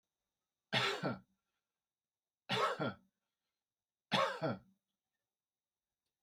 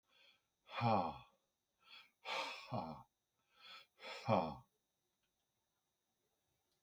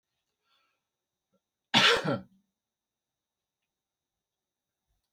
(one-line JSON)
{"three_cough_length": "6.2 s", "three_cough_amplitude": 3491, "three_cough_signal_mean_std_ratio": 0.35, "exhalation_length": "6.8 s", "exhalation_amplitude": 2870, "exhalation_signal_mean_std_ratio": 0.33, "cough_length": "5.1 s", "cough_amplitude": 16398, "cough_signal_mean_std_ratio": 0.22, "survey_phase": "beta (2021-08-13 to 2022-03-07)", "age": "65+", "gender": "Male", "wearing_mask": "No", "symptom_none": true, "smoker_status": "Ex-smoker", "respiratory_condition_asthma": false, "respiratory_condition_other": false, "recruitment_source": "REACT", "submission_delay": "1 day", "covid_test_result": "Negative", "covid_test_method": "RT-qPCR", "influenza_a_test_result": "Negative", "influenza_b_test_result": "Negative"}